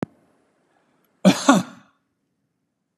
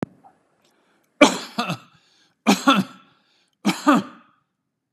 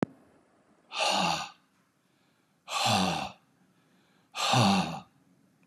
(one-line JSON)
{"cough_length": "3.0 s", "cough_amplitude": 31901, "cough_signal_mean_std_ratio": 0.24, "three_cough_length": "4.9 s", "three_cough_amplitude": 32767, "three_cough_signal_mean_std_ratio": 0.32, "exhalation_length": "5.7 s", "exhalation_amplitude": 9293, "exhalation_signal_mean_std_ratio": 0.46, "survey_phase": "beta (2021-08-13 to 2022-03-07)", "age": "65+", "gender": "Male", "wearing_mask": "No", "symptom_none": true, "smoker_status": "Ex-smoker", "respiratory_condition_asthma": false, "respiratory_condition_other": false, "recruitment_source": "REACT", "submission_delay": "1 day", "covid_test_result": "Negative", "covid_test_method": "RT-qPCR", "influenza_a_test_result": "Negative", "influenza_b_test_result": "Negative"}